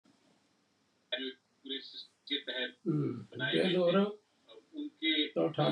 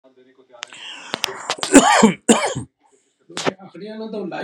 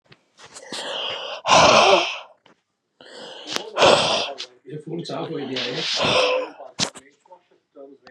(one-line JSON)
{"three_cough_length": "5.7 s", "three_cough_amplitude": 5018, "three_cough_signal_mean_std_ratio": 0.56, "cough_length": "4.4 s", "cough_amplitude": 32768, "cough_signal_mean_std_ratio": 0.39, "exhalation_length": "8.1 s", "exhalation_amplitude": 32767, "exhalation_signal_mean_std_ratio": 0.5, "survey_phase": "beta (2021-08-13 to 2022-03-07)", "age": "18-44", "gender": "Male", "wearing_mask": "No", "symptom_none": true, "symptom_onset": "12 days", "smoker_status": "Current smoker (1 to 10 cigarettes per day)", "respiratory_condition_asthma": false, "respiratory_condition_other": false, "recruitment_source": "REACT", "submission_delay": "1 day", "covid_test_result": "Negative", "covid_test_method": "RT-qPCR", "influenza_a_test_result": "Negative", "influenza_b_test_result": "Negative"}